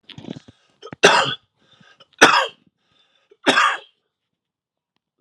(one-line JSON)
{"three_cough_length": "5.2 s", "three_cough_amplitude": 32768, "three_cough_signal_mean_std_ratio": 0.31, "survey_phase": "alpha (2021-03-01 to 2021-08-12)", "age": "45-64", "gender": "Female", "wearing_mask": "No", "symptom_cough_any": true, "symptom_shortness_of_breath": true, "symptom_headache": true, "symptom_onset": "3 days", "smoker_status": "Ex-smoker", "respiratory_condition_asthma": false, "respiratory_condition_other": false, "recruitment_source": "Test and Trace", "submission_delay": "2 days", "covid_test_result": "Positive", "covid_test_method": "RT-qPCR", "covid_ct_value": 17.3, "covid_ct_gene": "ORF1ab gene", "covid_ct_mean": 17.6, "covid_viral_load": "1700000 copies/ml", "covid_viral_load_category": "High viral load (>1M copies/ml)"}